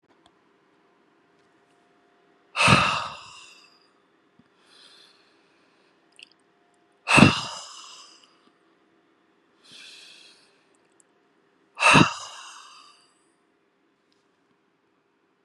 exhalation_length: 15.4 s
exhalation_amplitude: 32768
exhalation_signal_mean_std_ratio: 0.22
survey_phase: beta (2021-08-13 to 2022-03-07)
age: 45-64
gender: Male
wearing_mask: 'No'
symptom_none: true
smoker_status: Ex-smoker
respiratory_condition_asthma: false
respiratory_condition_other: false
recruitment_source: REACT
submission_delay: 2 days
covid_test_result: Negative
covid_test_method: RT-qPCR
influenza_a_test_result: Negative
influenza_b_test_result: Negative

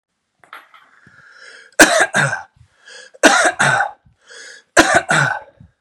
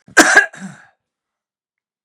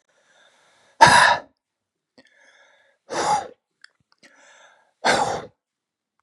three_cough_length: 5.8 s
three_cough_amplitude: 32768
three_cough_signal_mean_std_ratio: 0.42
cough_length: 2.0 s
cough_amplitude: 32768
cough_signal_mean_std_ratio: 0.3
exhalation_length: 6.2 s
exhalation_amplitude: 32768
exhalation_signal_mean_std_ratio: 0.29
survey_phase: beta (2021-08-13 to 2022-03-07)
age: 65+
gender: Male
wearing_mask: 'No'
symptom_cough_any: true
smoker_status: Never smoked
respiratory_condition_asthma: false
respiratory_condition_other: false
recruitment_source: REACT
submission_delay: 1 day
covid_test_result: Negative
covid_test_method: RT-qPCR
influenza_a_test_result: Negative
influenza_b_test_result: Negative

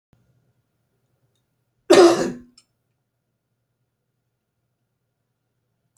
cough_length: 6.0 s
cough_amplitude: 32716
cough_signal_mean_std_ratio: 0.19
survey_phase: beta (2021-08-13 to 2022-03-07)
age: 65+
gender: Male
wearing_mask: 'No'
symptom_none: true
smoker_status: Ex-smoker
respiratory_condition_asthma: false
respiratory_condition_other: false
recruitment_source: REACT
submission_delay: 2 days
covid_test_result: Negative
covid_test_method: RT-qPCR
influenza_a_test_result: Negative
influenza_b_test_result: Negative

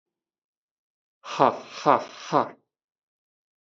exhalation_length: 3.7 s
exhalation_amplitude: 23956
exhalation_signal_mean_std_ratio: 0.26
survey_phase: beta (2021-08-13 to 2022-03-07)
age: 18-44
gender: Male
wearing_mask: 'Yes'
symptom_none: true
smoker_status: Ex-smoker
respiratory_condition_asthma: false
respiratory_condition_other: false
recruitment_source: REACT
submission_delay: 1 day
covid_test_result: Negative
covid_test_method: RT-qPCR
influenza_a_test_result: Negative
influenza_b_test_result: Negative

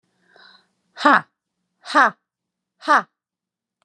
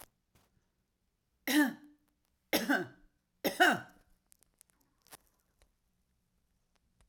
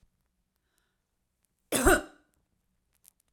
exhalation_length: 3.8 s
exhalation_amplitude: 30955
exhalation_signal_mean_std_ratio: 0.25
three_cough_length: 7.1 s
three_cough_amplitude: 6775
three_cough_signal_mean_std_ratio: 0.27
cough_length: 3.3 s
cough_amplitude: 12569
cough_signal_mean_std_ratio: 0.22
survey_phase: alpha (2021-03-01 to 2021-08-12)
age: 45-64
gender: Female
wearing_mask: 'No'
symptom_none: true
smoker_status: Never smoked
respiratory_condition_asthma: false
respiratory_condition_other: true
recruitment_source: REACT
submission_delay: 1 day
covid_test_result: Negative
covid_test_method: RT-qPCR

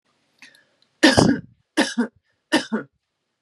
three_cough_length: 3.4 s
three_cough_amplitude: 32767
three_cough_signal_mean_std_ratio: 0.35
survey_phase: beta (2021-08-13 to 2022-03-07)
age: 18-44
gender: Female
wearing_mask: 'No'
symptom_none: true
smoker_status: Ex-smoker
respiratory_condition_asthma: false
respiratory_condition_other: false
recruitment_source: REACT
submission_delay: 2 days
covid_test_result: Negative
covid_test_method: RT-qPCR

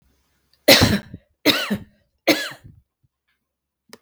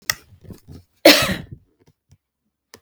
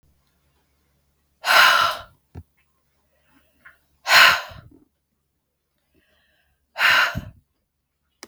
three_cough_length: 4.0 s
three_cough_amplitude: 32768
three_cough_signal_mean_std_ratio: 0.32
cough_length: 2.8 s
cough_amplitude: 32768
cough_signal_mean_std_ratio: 0.25
exhalation_length: 8.3 s
exhalation_amplitude: 32768
exhalation_signal_mean_std_ratio: 0.3
survey_phase: beta (2021-08-13 to 2022-03-07)
age: 45-64
gender: Female
wearing_mask: 'No'
symptom_runny_or_blocked_nose: true
symptom_onset: 12 days
smoker_status: Never smoked
respiratory_condition_asthma: false
respiratory_condition_other: false
recruitment_source: REACT
submission_delay: 3 days
covid_test_result: Negative
covid_test_method: RT-qPCR
influenza_a_test_result: Negative
influenza_b_test_result: Negative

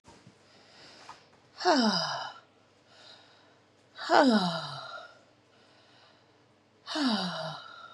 exhalation_length: 7.9 s
exhalation_amplitude: 16760
exhalation_signal_mean_std_ratio: 0.41
survey_phase: beta (2021-08-13 to 2022-03-07)
age: 18-44
gender: Female
wearing_mask: 'No'
symptom_cough_any: true
symptom_runny_or_blocked_nose: true
symptom_shortness_of_breath: true
symptom_sore_throat: true
symptom_abdominal_pain: true
symptom_diarrhoea: true
symptom_fatigue: true
symptom_fever_high_temperature: true
symptom_headache: true
symptom_change_to_sense_of_smell_or_taste: true
symptom_loss_of_taste: true
symptom_other: true
symptom_onset: 2 days
smoker_status: Never smoked
respiratory_condition_asthma: false
respiratory_condition_other: false
recruitment_source: Test and Trace
submission_delay: 2 days
covid_test_result: Positive
covid_test_method: RT-qPCR
covid_ct_value: 17.6
covid_ct_gene: N gene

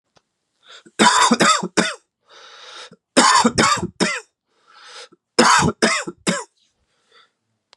three_cough_length: 7.8 s
three_cough_amplitude: 32461
three_cough_signal_mean_std_ratio: 0.44
survey_phase: beta (2021-08-13 to 2022-03-07)
age: 18-44
gender: Male
wearing_mask: 'No'
symptom_cough_any: true
symptom_new_continuous_cough: true
symptom_runny_or_blocked_nose: true
symptom_onset: 3 days
smoker_status: Ex-smoker
respiratory_condition_asthma: false
respiratory_condition_other: false
recruitment_source: Test and Trace
submission_delay: 2 days
covid_test_result: Positive
covid_test_method: RT-qPCR
covid_ct_value: 18.7
covid_ct_gene: ORF1ab gene
covid_ct_mean: 19.2
covid_viral_load: 500000 copies/ml
covid_viral_load_category: Low viral load (10K-1M copies/ml)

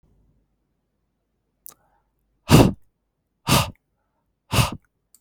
exhalation_length: 5.2 s
exhalation_amplitude: 32768
exhalation_signal_mean_std_ratio: 0.25
survey_phase: beta (2021-08-13 to 2022-03-07)
age: 45-64
gender: Male
wearing_mask: 'No'
symptom_none: true
smoker_status: Ex-smoker
respiratory_condition_asthma: false
respiratory_condition_other: false
recruitment_source: Test and Trace
submission_delay: 2 days
covid_test_result: Negative
covid_test_method: RT-qPCR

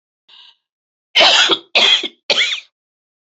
three_cough_length: 3.3 s
three_cough_amplitude: 32768
three_cough_signal_mean_std_ratio: 0.45
survey_phase: beta (2021-08-13 to 2022-03-07)
age: 65+
gender: Female
wearing_mask: 'No'
symptom_cough_any: true
symptom_sore_throat: true
symptom_onset: 5 days
smoker_status: Never smoked
respiratory_condition_asthma: false
respiratory_condition_other: false
recruitment_source: Test and Trace
submission_delay: 3 days
covid_test_result: Positive
covid_test_method: ePCR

